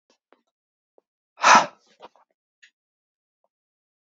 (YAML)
exhalation_length: 4.0 s
exhalation_amplitude: 27490
exhalation_signal_mean_std_ratio: 0.18
survey_phase: beta (2021-08-13 to 2022-03-07)
age: 18-44
gender: Male
wearing_mask: 'No'
symptom_runny_or_blocked_nose: true
symptom_headache: true
symptom_change_to_sense_of_smell_or_taste: true
symptom_onset: 3 days
smoker_status: Never smoked
respiratory_condition_asthma: false
respiratory_condition_other: false
recruitment_source: Test and Trace
submission_delay: 2 days
covid_test_result: Positive
covid_test_method: RT-qPCR